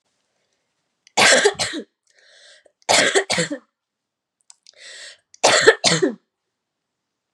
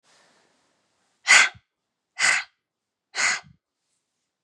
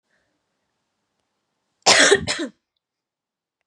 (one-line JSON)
{"three_cough_length": "7.3 s", "three_cough_amplitude": 32767, "three_cough_signal_mean_std_ratio": 0.36, "exhalation_length": "4.4 s", "exhalation_amplitude": 28201, "exhalation_signal_mean_std_ratio": 0.28, "cough_length": "3.7 s", "cough_amplitude": 31034, "cough_signal_mean_std_ratio": 0.27, "survey_phase": "beta (2021-08-13 to 2022-03-07)", "age": "18-44", "gender": "Female", "wearing_mask": "No", "symptom_shortness_of_breath": true, "symptom_sore_throat": true, "symptom_diarrhoea": true, "symptom_fatigue": true, "symptom_headache": true, "symptom_onset": "6 days", "smoker_status": "Never smoked", "respiratory_condition_asthma": false, "respiratory_condition_other": false, "recruitment_source": "Test and Trace", "submission_delay": "1 day", "covid_test_result": "Positive", "covid_test_method": "RT-qPCR", "covid_ct_value": 25.0, "covid_ct_gene": "N gene"}